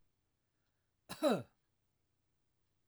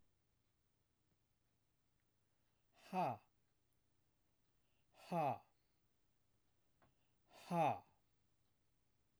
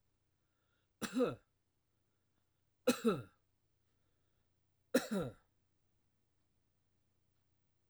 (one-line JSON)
{"cough_length": "2.9 s", "cough_amplitude": 2862, "cough_signal_mean_std_ratio": 0.22, "exhalation_length": "9.2 s", "exhalation_amplitude": 1319, "exhalation_signal_mean_std_ratio": 0.26, "three_cough_length": "7.9 s", "three_cough_amplitude": 3607, "three_cough_signal_mean_std_ratio": 0.25, "survey_phase": "beta (2021-08-13 to 2022-03-07)", "age": "65+", "gender": "Male", "wearing_mask": "No", "symptom_none": true, "smoker_status": "Never smoked", "respiratory_condition_asthma": false, "respiratory_condition_other": false, "recruitment_source": "REACT", "submission_delay": "1 day", "covid_test_result": "Negative", "covid_test_method": "RT-qPCR"}